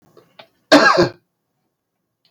{
  "cough_length": "2.3 s",
  "cough_amplitude": 32723,
  "cough_signal_mean_std_ratio": 0.32,
  "survey_phase": "beta (2021-08-13 to 2022-03-07)",
  "age": "65+",
  "gender": "Male",
  "wearing_mask": "No",
  "symptom_none": true,
  "smoker_status": "Ex-smoker",
  "respiratory_condition_asthma": false,
  "respiratory_condition_other": false,
  "recruitment_source": "REACT",
  "submission_delay": "1 day",
  "covid_test_result": "Negative",
  "covid_test_method": "RT-qPCR"
}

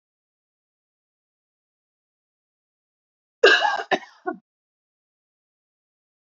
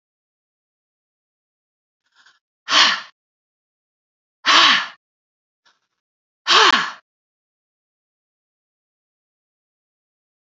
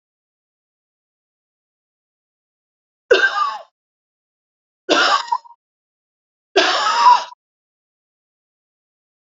{
  "cough_length": "6.4 s",
  "cough_amplitude": 28430,
  "cough_signal_mean_std_ratio": 0.19,
  "exhalation_length": "10.6 s",
  "exhalation_amplitude": 31808,
  "exhalation_signal_mean_std_ratio": 0.25,
  "three_cough_length": "9.4 s",
  "three_cough_amplitude": 32768,
  "three_cough_signal_mean_std_ratio": 0.31,
  "survey_phase": "beta (2021-08-13 to 2022-03-07)",
  "age": "45-64",
  "gender": "Female",
  "wearing_mask": "No",
  "symptom_none": true,
  "smoker_status": "Ex-smoker",
  "respiratory_condition_asthma": false,
  "respiratory_condition_other": false,
  "recruitment_source": "REACT",
  "submission_delay": "2 days",
  "covid_test_result": "Negative",
  "covid_test_method": "RT-qPCR",
  "influenza_a_test_result": "Negative",
  "influenza_b_test_result": "Negative"
}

